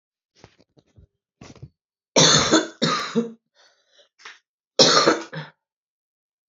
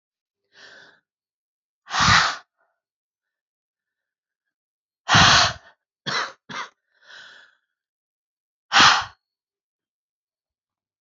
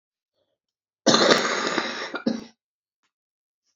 {"three_cough_length": "6.5 s", "three_cough_amplitude": 32767, "three_cough_signal_mean_std_ratio": 0.35, "exhalation_length": "11.0 s", "exhalation_amplitude": 27815, "exhalation_signal_mean_std_ratio": 0.27, "cough_length": "3.8 s", "cough_amplitude": 32767, "cough_signal_mean_std_ratio": 0.4, "survey_phase": "beta (2021-08-13 to 2022-03-07)", "age": "45-64", "gender": "Female", "wearing_mask": "No", "symptom_cough_any": true, "symptom_runny_or_blocked_nose": true, "symptom_shortness_of_breath": true, "symptom_fatigue": true, "symptom_change_to_sense_of_smell_or_taste": true, "symptom_loss_of_taste": true, "symptom_onset": "7 days", "smoker_status": "Current smoker (1 to 10 cigarettes per day)", "respiratory_condition_asthma": true, "respiratory_condition_other": false, "recruitment_source": "Test and Trace", "submission_delay": "1 day", "covid_test_result": "Positive", "covid_test_method": "ePCR"}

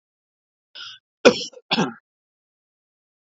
{"cough_length": "3.2 s", "cough_amplitude": 29507, "cough_signal_mean_std_ratio": 0.22, "survey_phase": "beta (2021-08-13 to 2022-03-07)", "age": "45-64", "gender": "Male", "wearing_mask": "No", "symptom_none": true, "smoker_status": "Never smoked", "respiratory_condition_asthma": false, "respiratory_condition_other": false, "recruitment_source": "REACT", "submission_delay": "1 day", "covid_test_result": "Negative", "covid_test_method": "RT-qPCR", "influenza_a_test_result": "Negative", "influenza_b_test_result": "Negative"}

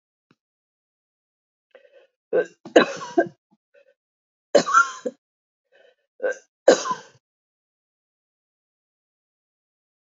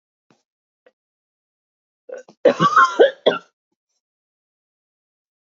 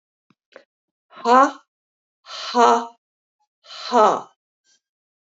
{"three_cough_length": "10.2 s", "three_cough_amplitude": 30531, "three_cough_signal_mean_std_ratio": 0.23, "cough_length": "5.5 s", "cough_amplitude": 27542, "cough_signal_mean_std_ratio": 0.25, "exhalation_length": "5.4 s", "exhalation_amplitude": 28079, "exhalation_signal_mean_std_ratio": 0.31, "survey_phase": "alpha (2021-03-01 to 2021-08-12)", "age": "45-64", "gender": "Female", "wearing_mask": "No", "symptom_none": true, "smoker_status": "Never smoked", "respiratory_condition_asthma": false, "respiratory_condition_other": false, "recruitment_source": "REACT", "submission_delay": "2 days", "covid_test_result": "Negative", "covid_test_method": "RT-qPCR"}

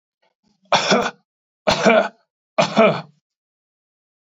{"three_cough_length": "4.4 s", "three_cough_amplitude": 26513, "three_cough_signal_mean_std_ratio": 0.4, "survey_phase": "beta (2021-08-13 to 2022-03-07)", "age": "65+", "gender": "Male", "wearing_mask": "No", "symptom_none": true, "smoker_status": "Never smoked", "respiratory_condition_asthma": false, "respiratory_condition_other": false, "recruitment_source": "REACT", "submission_delay": "7 days", "covid_test_result": "Negative", "covid_test_method": "RT-qPCR", "influenza_a_test_result": "Negative", "influenza_b_test_result": "Negative"}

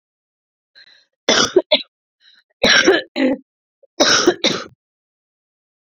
{"three_cough_length": "5.9 s", "three_cough_amplitude": 32403, "three_cough_signal_mean_std_ratio": 0.39, "survey_phase": "beta (2021-08-13 to 2022-03-07)", "age": "18-44", "gender": "Female", "wearing_mask": "No", "symptom_cough_any": true, "symptom_runny_or_blocked_nose": true, "symptom_sore_throat": true, "symptom_headache": true, "smoker_status": "Current smoker (1 to 10 cigarettes per day)", "respiratory_condition_asthma": false, "respiratory_condition_other": false, "recruitment_source": "Test and Trace", "submission_delay": "2 days", "covid_test_result": "Positive", "covid_test_method": "RT-qPCR", "covid_ct_value": 20.9, "covid_ct_gene": "ORF1ab gene", "covid_ct_mean": 21.4, "covid_viral_load": "92000 copies/ml", "covid_viral_load_category": "Low viral load (10K-1M copies/ml)"}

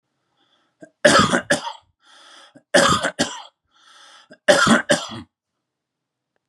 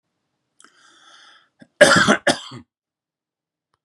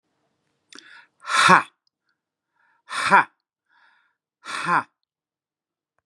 {"three_cough_length": "6.5 s", "three_cough_amplitude": 32767, "three_cough_signal_mean_std_ratio": 0.37, "cough_length": "3.8 s", "cough_amplitude": 32768, "cough_signal_mean_std_ratio": 0.27, "exhalation_length": "6.1 s", "exhalation_amplitude": 31218, "exhalation_signal_mean_std_ratio": 0.27, "survey_phase": "beta (2021-08-13 to 2022-03-07)", "age": "45-64", "gender": "Male", "wearing_mask": "No", "symptom_none": true, "smoker_status": "Ex-smoker", "respiratory_condition_asthma": false, "respiratory_condition_other": false, "recruitment_source": "REACT", "submission_delay": "2 days", "covid_test_result": "Negative", "covid_test_method": "RT-qPCR", "influenza_a_test_result": "Negative", "influenza_b_test_result": "Negative"}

